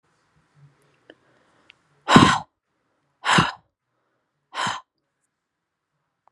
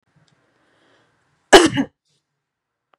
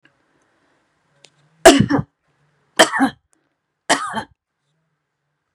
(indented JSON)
{
  "exhalation_length": "6.3 s",
  "exhalation_amplitude": 32768,
  "exhalation_signal_mean_std_ratio": 0.24,
  "cough_length": "3.0 s",
  "cough_amplitude": 32768,
  "cough_signal_mean_std_ratio": 0.21,
  "three_cough_length": "5.5 s",
  "three_cough_amplitude": 32768,
  "three_cough_signal_mean_std_ratio": 0.26,
  "survey_phase": "beta (2021-08-13 to 2022-03-07)",
  "age": "45-64",
  "gender": "Female",
  "wearing_mask": "No",
  "symptom_runny_or_blocked_nose": true,
  "smoker_status": "Never smoked",
  "respiratory_condition_asthma": true,
  "respiratory_condition_other": false,
  "recruitment_source": "REACT",
  "submission_delay": "1 day",
  "covid_test_result": "Negative",
  "covid_test_method": "RT-qPCR",
  "influenza_a_test_result": "Negative",
  "influenza_b_test_result": "Negative"
}